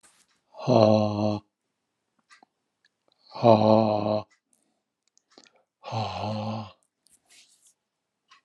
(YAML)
exhalation_length: 8.4 s
exhalation_amplitude: 23833
exhalation_signal_mean_std_ratio: 0.34
survey_phase: alpha (2021-03-01 to 2021-08-12)
age: 65+
gender: Male
wearing_mask: 'No'
symptom_none: true
smoker_status: Never smoked
respiratory_condition_asthma: false
respiratory_condition_other: true
recruitment_source: REACT
submission_delay: 1 day
covid_test_result: Negative
covid_test_method: RT-qPCR